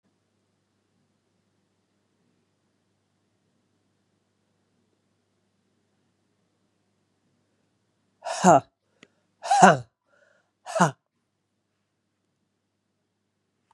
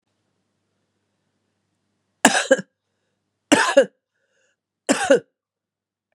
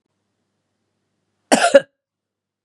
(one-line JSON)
{"exhalation_length": "13.7 s", "exhalation_amplitude": 30749, "exhalation_signal_mean_std_ratio": 0.16, "three_cough_length": "6.1 s", "three_cough_amplitude": 32768, "three_cough_signal_mean_std_ratio": 0.26, "cough_length": "2.6 s", "cough_amplitude": 32768, "cough_signal_mean_std_ratio": 0.22, "survey_phase": "beta (2021-08-13 to 2022-03-07)", "age": "45-64", "gender": "Female", "wearing_mask": "No", "symptom_runny_or_blocked_nose": true, "symptom_sore_throat": true, "symptom_headache": true, "smoker_status": "Ex-smoker", "respiratory_condition_asthma": false, "respiratory_condition_other": false, "recruitment_source": "Test and Trace", "submission_delay": "1 day", "covid_test_result": "Positive", "covid_test_method": "LFT"}